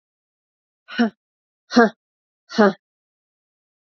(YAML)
exhalation_length: 3.8 s
exhalation_amplitude: 27920
exhalation_signal_mean_std_ratio: 0.24
survey_phase: beta (2021-08-13 to 2022-03-07)
age: 45-64
gender: Female
wearing_mask: 'No'
symptom_cough_any: true
symptom_new_continuous_cough: true
symptom_runny_or_blocked_nose: true
symptom_sore_throat: true
symptom_fatigue: true
symptom_headache: true
symptom_change_to_sense_of_smell_or_taste: true
symptom_loss_of_taste: true
smoker_status: Never smoked
respiratory_condition_asthma: false
respiratory_condition_other: false
recruitment_source: Test and Trace
submission_delay: 1 day
covid_test_result: Positive
covid_test_method: RT-qPCR
covid_ct_value: 14.1
covid_ct_gene: ORF1ab gene
covid_ct_mean: 14.6
covid_viral_load: 17000000 copies/ml
covid_viral_load_category: High viral load (>1M copies/ml)